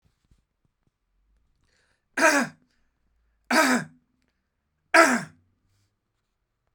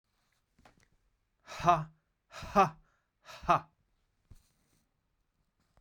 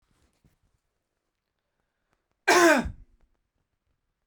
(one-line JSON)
{"three_cough_length": "6.7 s", "three_cough_amplitude": 24339, "three_cough_signal_mean_std_ratio": 0.28, "exhalation_length": "5.8 s", "exhalation_amplitude": 9396, "exhalation_signal_mean_std_ratio": 0.23, "cough_length": "4.3 s", "cough_amplitude": 17163, "cough_signal_mean_std_ratio": 0.24, "survey_phase": "beta (2021-08-13 to 2022-03-07)", "age": "45-64", "gender": "Male", "wearing_mask": "No", "symptom_none": true, "smoker_status": "Never smoked", "respiratory_condition_asthma": false, "respiratory_condition_other": false, "recruitment_source": "Test and Trace", "submission_delay": "1 day", "covid_test_result": "Positive", "covid_test_method": "RT-qPCR", "covid_ct_value": 18.5, "covid_ct_gene": "ORF1ab gene", "covid_ct_mean": 18.7, "covid_viral_load": "730000 copies/ml", "covid_viral_load_category": "Low viral load (10K-1M copies/ml)"}